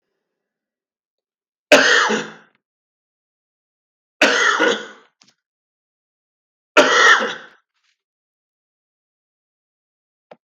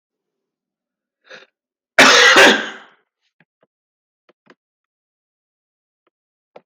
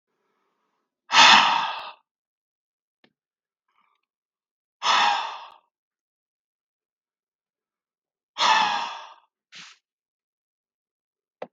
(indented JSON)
{
  "three_cough_length": "10.5 s",
  "three_cough_amplitude": 32766,
  "three_cough_signal_mean_std_ratio": 0.3,
  "cough_length": "6.7 s",
  "cough_amplitude": 32768,
  "cough_signal_mean_std_ratio": 0.26,
  "exhalation_length": "11.5 s",
  "exhalation_amplitude": 32766,
  "exhalation_signal_mean_std_ratio": 0.27,
  "survey_phase": "beta (2021-08-13 to 2022-03-07)",
  "age": "65+",
  "gender": "Male",
  "wearing_mask": "No",
  "symptom_none": true,
  "smoker_status": "Ex-smoker",
  "respiratory_condition_asthma": false,
  "respiratory_condition_other": false,
  "recruitment_source": "REACT",
  "submission_delay": "2 days",
  "covid_test_result": "Negative",
  "covid_test_method": "RT-qPCR",
  "influenza_a_test_result": "Negative",
  "influenza_b_test_result": "Negative"
}